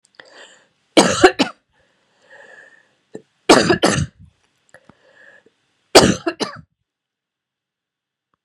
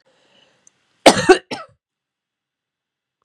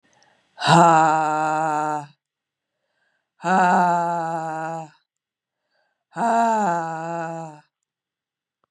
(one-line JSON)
{"three_cough_length": "8.4 s", "three_cough_amplitude": 32768, "three_cough_signal_mean_std_ratio": 0.28, "cough_length": "3.2 s", "cough_amplitude": 32768, "cough_signal_mean_std_ratio": 0.21, "exhalation_length": "8.7 s", "exhalation_amplitude": 26930, "exhalation_signal_mean_std_ratio": 0.51, "survey_phase": "beta (2021-08-13 to 2022-03-07)", "age": "45-64", "gender": "Female", "wearing_mask": "No", "symptom_cough_any": true, "symptom_new_continuous_cough": true, "symptom_runny_or_blocked_nose": true, "symptom_sore_throat": true, "symptom_onset": "3 days", "smoker_status": "Never smoked", "respiratory_condition_asthma": true, "respiratory_condition_other": false, "recruitment_source": "Test and Trace", "submission_delay": "2 days", "covid_test_result": "Positive", "covid_test_method": "RT-qPCR", "covid_ct_value": 27.0, "covid_ct_gene": "N gene"}